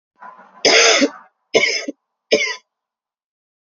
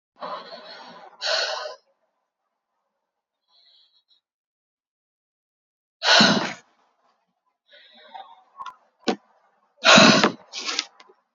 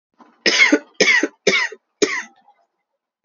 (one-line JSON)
{"three_cough_length": "3.7 s", "three_cough_amplitude": 32622, "three_cough_signal_mean_std_ratio": 0.41, "exhalation_length": "11.3 s", "exhalation_amplitude": 28696, "exhalation_signal_mean_std_ratio": 0.28, "cough_length": "3.2 s", "cough_amplitude": 29246, "cough_signal_mean_std_ratio": 0.44, "survey_phase": "beta (2021-08-13 to 2022-03-07)", "age": "18-44", "gender": "Female", "wearing_mask": "No", "symptom_cough_any": true, "symptom_runny_or_blocked_nose": true, "symptom_headache": true, "symptom_change_to_sense_of_smell_or_taste": true, "symptom_onset": "6 days", "smoker_status": "Never smoked", "respiratory_condition_asthma": false, "respiratory_condition_other": false, "recruitment_source": "Test and Trace", "submission_delay": "2 days", "covid_test_result": "Positive", "covid_test_method": "RT-qPCR", "covid_ct_value": 21.1, "covid_ct_gene": "ORF1ab gene"}